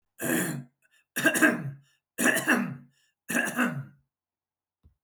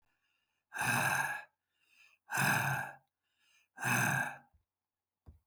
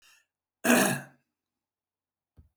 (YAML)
three_cough_length: 5.0 s
three_cough_amplitude: 13687
three_cough_signal_mean_std_ratio: 0.49
exhalation_length: 5.5 s
exhalation_amplitude: 3783
exhalation_signal_mean_std_ratio: 0.49
cough_length: 2.6 s
cough_amplitude: 13109
cough_signal_mean_std_ratio: 0.29
survey_phase: beta (2021-08-13 to 2022-03-07)
age: 65+
gender: Male
wearing_mask: 'No'
symptom_none: true
smoker_status: Ex-smoker
respiratory_condition_asthma: false
respiratory_condition_other: false
recruitment_source: REACT
submission_delay: 2 days
covid_test_result: Negative
covid_test_method: RT-qPCR
influenza_a_test_result: Negative
influenza_b_test_result: Negative